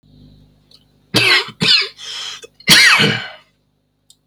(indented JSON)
{
  "three_cough_length": "4.3 s",
  "three_cough_amplitude": 32768,
  "three_cough_signal_mean_std_ratio": 0.45,
  "survey_phase": "beta (2021-08-13 to 2022-03-07)",
  "age": "45-64",
  "gender": "Male",
  "wearing_mask": "No",
  "symptom_cough_any": true,
  "symptom_diarrhoea": true,
  "smoker_status": "Ex-smoker",
  "respiratory_condition_asthma": false,
  "respiratory_condition_other": false,
  "recruitment_source": "REACT",
  "submission_delay": "0 days",
  "covid_test_result": "Negative",
  "covid_test_method": "RT-qPCR"
}